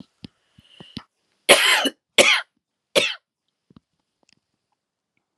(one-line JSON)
{"cough_length": "5.4 s", "cough_amplitude": 32768, "cough_signal_mean_std_ratio": 0.29, "survey_phase": "alpha (2021-03-01 to 2021-08-12)", "age": "45-64", "gender": "Female", "wearing_mask": "No", "symptom_abdominal_pain": true, "symptom_fatigue": true, "symptom_headache": true, "symptom_change_to_sense_of_smell_or_taste": true, "symptom_onset": "8 days", "smoker_status": "Never smoked", "respiratory_condition_asthma": false, "respiratory_condition_other": false, "recruitment_source": "Test and Trace", "submission_delay": "2 days", "covid_test_result": "Positive", "covid_test_method": "RT-qPCR", "covid_ct_value": 25.3, "covid_ct_gene": "ORF1ab gene"}